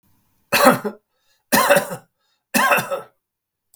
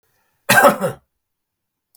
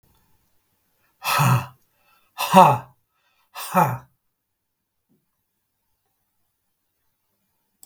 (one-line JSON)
{"three_cough_length": "3.8 s", "three_cough_amplitude": 32768, "three_cough_signal_mean_std_ratio": 0.42, "cough_length": "2.0 s", "cough_amplitude": 32768, "cough_signal_mean_std_ratio": 0.33, "exhalation_length": "7.9 s", "exhalation_amplitude": 32768, "exhalation_signal_mean_std_ratio": 0.26, "survey_phase": "beta (2021-08-13 to 2022-03-07)", "age": "65+", "gender": "Male", "wearing_mask": "No", "symptom_none": true, "smoker_status": "Ex-smoker", "respiratory_condition_asthma": false, "respiratory_condition_other": false, "recruitment_source": "REACT", "submission_delay": "1 day", "covid_test_result": "Negative", "covid_test_method": "RT-qPCR", "influenza_a_test_result": "Negative", "influenza_b_test_result": "Negative"}